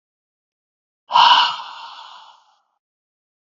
{"exhalation_length": "3.5 s", "exhalation_amplitude": 29824, "exhalation_signal_mean_std_ratio": 0.3, "survey_phase": "beta (2021-08-13 to 2022-03-07)", "age": "18-44", "gender": "Male", "wearing_mask": "No", "symptom_none": true, "smoker_status": "Never smoked", "respiratory_condition_asthma": false, "respiratory_condition_other": false, "recruitment_source": "Test and Trace", "submission_delay": "2 days", "covid_test_result": "Positive", "covid_test_method": "RT-qPCR", "covid_ct_value": 26.1, "covid_ct_gene": "S gene", "covid_ct_mean": 26.5, "covid_viral_load": "2100 copies/ml", "covid_viral_load_category": "Minimal viral load (< 10K copies/ml)"}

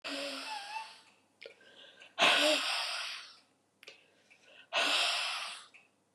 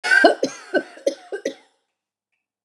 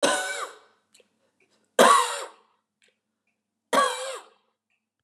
{"exhalation_length": "6.1 s", "exhalation_amplitude": 7505, "exhalation_signal_mean_std_ratio": 0.51, "cough_length": "2.6 s", "cough_amplitude": 32581, "cough_signal_mean_std_ratio": 0.37, "three_cough_length": "5.0 s", "three_cough_amplitude": 22381, "three_cough_signal_mean_std_ratio": 0.34, "survey_phase": "beta (2021-08-13 to 2022-03-07)", "age": "65+", "gender": "Female", "wearing_mask": "No", "symptom_cough_any": true, "symptom_runny_or_blocked_nose": true, "symptom_sore_throat": true, "symptom_fatigue": true, "symptom_fever_high_temperature": true, "symptom_headache": true, "symptom_onset": "4 days", "smoker_status": "Ex-smoker", "respiratory_condition_asthma": false, "respiratory_condition_other": false, "recruitment_source": "Test and Trace", "submission_delay": "2 days", "covid_test_result": "Positive", "covid_test_method": "RT-qPCR", "covid_ct_value": 21.9, "covid_ct_gene": "N gene"}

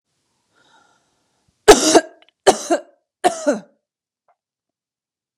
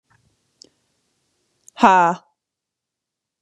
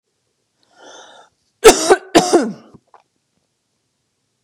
{"three_cough_length": "5.4 s", "three_cough_amplitude": 32768, "three_cough_signal_mean_std_ratio": 0.25, "exhalation_length": "3.4 s", "exhalation_amplitude": 32767, "exhalation_signal_mean_std_ratio": 0.24, "cough_length": "4.4 s", "cough_amplitude": 32768, "cough_signal_mean_std_ratio": 0.27, "survey_phase": "beta (2021-08-13 to 2022-03-07)", "age": "18-44", "gender": "Female", "wearing_mask": "No", "symptom_none": true, "smoker_status": "Never smoked", "respiratory_condition_asthma": false, "respiratory_condition_other": false, "recruitment_source": "REACT", "submission_delay": "1 day", "covid_test_result": "Negative", "covid_test_method": "RT-qPCR", "influenza_a_test_result": "Negative", "influenza_b_test_result": "Negative"}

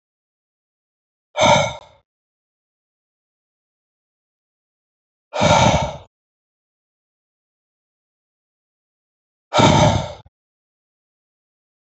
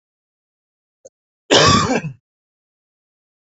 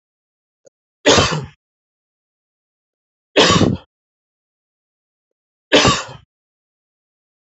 {"exhalation_length": "11.9 s", "exhalation_amplitude": 32763, "exhalation_signal_mean_std_ratio": 0.27, "cough_length": "3.5 s", "cough_amplitude": 31309, "cough_signal_mean_std_ratio": 0.31, "three_cough_length": "7.5 s", "three_cough_amplitude": 31192, "three_cough_signal_mean_std_ratio": 0.29, "survey_phase": "alpha (2021-03-01 to 2021-08-12)", "age": "45-64", "gender": "Male", "wearing_mask": "No", "symptom_none": true, "symptom_onset": "2 days", "smoker_status": "Never smoked", "respiratory_condition_asthma": false, "respiratory_condition_other": false, "recruitment_source": "REACT", "submission_delay": "2 days", "covid_test_result": "Negative", "covid_test_method": "RT-qPCR"}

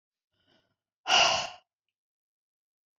{"exhalation_length": "3.0 s", "exhalation_amplitude": 11697, "exhalation_signal_mean_std_ratio": 0.28, "survey_phase": "beta (2021-08-13 to 2022-03-07)", "age": "65+", "gender": "Female", "wearing_mask": "No", "symptom_none": true, "smoker_status": "Ex-smoker", "respiratory_condition_asthma": false, "respiratory_condition_other": false, "recruitment_source": "REACT", "submission_delay": "2 days", "covid_test_result": "Negative", "covid_test_method": "RT-qPCR"}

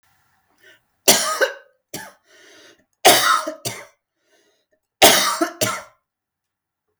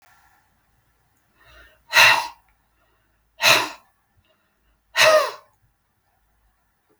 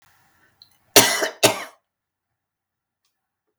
{"three_cough_length": "7.0 s", "three_cough_amplitude": 32768, "three_cough_signal_mean_std_ratio": 0.35, "exhalation_length": "7.0 s", "exhalation_amplitude": 32482, "exhalation_signal_mean_std_ratio": 0.28, "cough_length": "3.6 s", "cough_amplitude": 32768, "cough_signal_mean_std_ratio": 0.24, "survey_phase": "beta (2021-08-13 to 2022-03-07)", "age": "45-64", "gender": "Female", "wearing_mask": "No", "symptom_none": true, "smoker_status": "Never smoked", "respiratory_condition_asthma": true, "respiratory_condition_other": false, "recruitment_source": "REACT", "submission_delay": "1 day", "covid_test_result": "Negative", "covid_test_method": "RT-qPCR", "influenza_a_test_result": "Negative", "influenza_b_test_result": "Negative"}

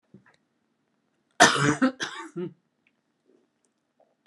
{"cough_length": "4.3 s", "cough_amplitude": 27275, "cough_signal_mean_std_ratio": 0.28, "survey_phase": "beta (2021-08-13 to 2022-03-07)", "age": "65+", "gender": "Female", "wearing_mask": "No", "symptom_cough_any": true, "symptom_shortness_of_breath": true, "symptom_fatigue": true, "symptom_onset": "5 days", "smoker_status": "Never smoked", "respiratory_condition_asthma": false, "respiratory_condition_other": false, "recruitment_source": "REACT", "submission_delay": "1 day", "covid_test_result": "Negative", "covid_test_method": "RT-qPCR"}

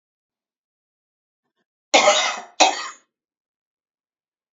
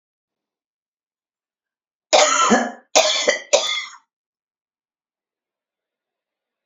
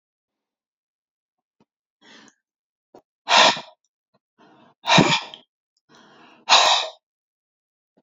{"cough_length": "4.5 s", "cough_amplitude": 30768, "cough_signal_mean_std_ratio": 0.28, "three_cough_length": "6.7 s", "three_cough_amplitude": 31782, "three_cough_signal_mean_std_ratio": 0.33, "exhalation_length": "8.0 s", "exhalation_amplitude": 32767, "exhalation_signal_mean_std_ratio": 0.27, "survey_phase": "beta (2021-08-13 to 2022-03-07)", "age": "45-64", "gender": "Female", "wearing_mask": "No", "symptom_none": true, "smoker_status": "Current smoker (11 or more cigarettes per day)", "respiratory_condition_asthma": false, "respiratory_condition_other": false, "recruitment_source": "REACT", "submission_delay": "1 day", "covid_test_result": "Negative", "covid_test_method": "RT-qPCR"}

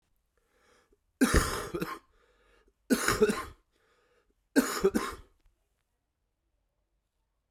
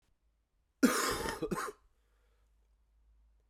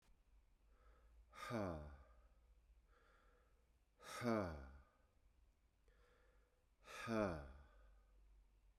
{"three_cough_length": "7.5 s", "three_cough_amplitude": 9873, "three_cough_signal_mean_std_ratio": 0.33, "cough_length": "3.5 s", "cough_amplitude": 6621, "cough_signal_mean_std_ratio": 0.35, "exhalation_length": "8.8 s", "exhalation_amplitude": 1062, "exhalation_signal_mean_std_ratio": 0.4, "survey_phase": "beta (2021-08-13 to 2022-03-07)", "age": "45-64", "gender": "Male", "wearing_mask": "No", "symptom_cough_any": true, "symptom_runny_or_blocked_nose": true, "symptom_fatigue": true, "symptom_headache": true, "symptom_onset": "5 days", "smoker_status": "Never smoked", "respiratory_condition_asthma": false, "respiratory_condition_other": false, "recruitment_source": "Test and Trace", "submission_delay": "2 days", "covid_test_result": "Positive", "covid_test_method": "RT-qPCR"}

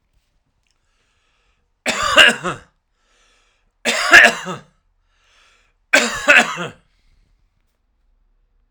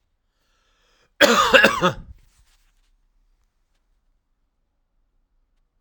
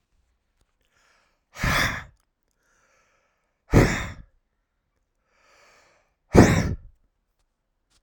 {"three_cough_length": "8.7 s", "three_cough_amplitude": 32768, "three_cough_signal_mean_std_ratio": 0.3, "cough_length": "5.8 s", "cough_amplitude": 32767, "cough_signal_mean_std_ratio": 0.26, "exhalation_length": "8.0 s", "exhalation_amplitude": 32767, "exhalation_signal_mean_std_ratio": 0.26, "survey_phase": "alpha (2021-03-01 to 2021-08-12)", "age": "45-64", "gender": "Male", "wearing_mask": "No", "symptom_none": true, "smoker_status": "Ex-smoker", "respiratory_condition_asthma": false, "respiratory_condition_other": false, "recruitment_source": "REACT", "submission_delay": "7 days", "covid_test_result": "Negative", "covid_test_method": "RT-qPCR"}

